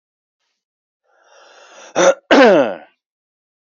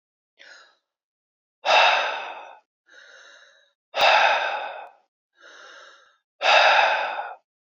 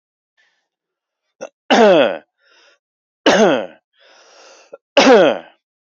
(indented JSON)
{
  "cough_length": "3.7 s",
  "cough_amplitude": 28341,
  "cough_signal_mean_std_ratio": 0.34,
  "exhalation_length": "7.8 s",
  "exhalation_amplitude": 24613,
  "exhalation_signal_mean_std_ratio": 0.43,
  "three_cough_length": "5.9 s",
  "three_cough_amplitude": 29310,
  "three_cough_signal_mean_std_ratio": 0.38,
  "survey_phase": "beta (2021-08-13 to 2022-03-07)",
  "age": "18-44",
  "gender": "Male",
  "wearing_mask": "No",
  "symptom_none": true,
  "smoker_status": "Never smoked",
  "respiratory_condition_asthma": false,
  "respiratory_condition_other": false,
  "recruitment_source": "REACT",
  "submission_delay": "0 days",
  "covid_test_result": "Negative",
  "covid_test_method": "RT-qPCR",
  "influenza_a_test_result": "Negative",
  "influenza_b_test_result": "Negative"
}